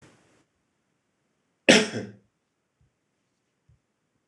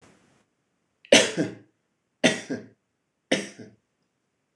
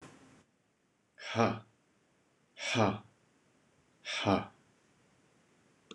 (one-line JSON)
{"cough_length": "4.3 s", "cough_amplitude": 26027, "cough_signal_mean_std_ratio": 0.17, "three_cough_length": "4.6 s", "three_cough_amplitude": 25764, "three_cough_signal_mean_std_ratio": 0.26, "exhalation_length": "5.9 s", "exhalation_amplitude": 7186, "exhalation_signal_mean_std_ratio": 0.32, "survey_phase": "beta (2021-08-13 to 2022-03-07)", "age": "45-64", "gender": "Male", "wearing_mask": "No", "symptom_none": true, "smoker_status": "Never smoked", "respiratory_condition_asthma": false, "respiratory_condition_other": false, "recruitment_source": "REACT", "submission_delay": "0 days", "covid_test_result": "Negative", "covid_test_method": "RT-qPCR"}